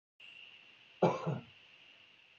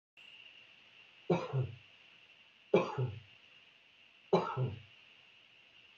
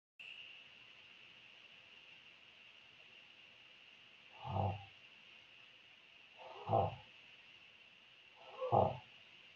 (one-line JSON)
{"cough_length": "2.4 s", "cough_amplitude": 5609, "cough_signal_mean_std_ratio": 0.33, "three_cough_length": "6.0 s", "three_cough_amplitude": 6138, "three_cough_signal_mean_std_ratio": 0.36, "exhalation_length": "9.6 s", "exhalation_amplitude": 3723, "exhalation_signal_mean_std_ratio": 0.35, "survey_phase": "beta (2021-08-13 to 2022-03-07)", "age": "65+", "gender": "Male", "wearing_mask": "No", "symptom_runny_or_blocked_nose": true, "smoker_status": "Ex-smoker", "respiratory_condition_asthma": false, "respiratory_condition_other": false, "recruitment_source": "REACT", "submission_delay": "1 day", "covid_test_result": "Negative", "covid_test_method": "RT-qPCR", "influenza_a_test_result": "Negative", "influenza_b_test_result": "Negative"}